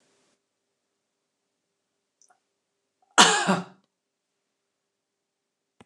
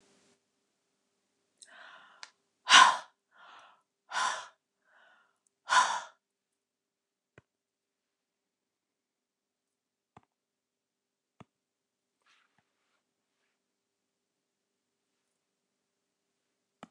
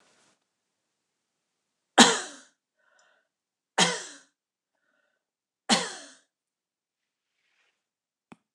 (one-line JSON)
{"cough_length": "5.9 s", "cough_amplitude": 28803, "cough_signal_mean_std_ratio": 0.19, "exhalation_length": "16.9 s", "exhalation_amplitude": 17945, "exhalation_signal_mean_std_ratio": 0.15, "three_cough_length": "8.5 s", "three_cough_amplitude": 29199, "three_cough_signal_mean_std_ratio": 0.18, "survey_phase": "beta (2021-08-13 to 2022-03-07)", "age": "65+", "gender": "Female", "wearing_mask": "No", "symptom_none": true, "smoker_status": "Never smoked", "respiratory_condition_asthma": false, "respiratory_condition_other": false, "recruitment_source": "REACT", "submission_delay": "1 day", "covid_test_result": "Negative", "covid_test_method": "RT-qPCR", "influenza_a_test_result": "Negative", "influenza_b_test_result": "Negative"}